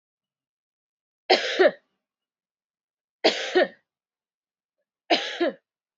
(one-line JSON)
{"three_cough_length": "6.0 s", "three_cough_amplitude": 19857, "three_cough_signal_mean_std_ratio": 0.3, "survey_phase": "beta (2021-08-13 to 2022-03-07)", "age": "18-44", "gender": "Female", "wearing_mask": "No", "symptom_shortness_of_breath": true, "symptom_fatigue": true, "symptom_fever_high_temperature": true, "symptom_headache": true, "symptom_change_to_sense_of_smell_or_taste": true, "smoker_status": "Never smoked", "respiratory_condition_asthma": false, "respiratory_condition_other": false, "recruitment_source": "Test and Trace", "submission_delay": "2 days", "covid_test_result": "Positive", "covid_test_method": "RT-qPCR", "covid_ct_value": 19.1, "covid_ct_gene": "ORF1ab gene", "covid_ct_mean": 20.1, "covid_viral_load": "250000 copies/ml", "covid_viral_load_category": "Low viral load (10K-1M copies/ml)"}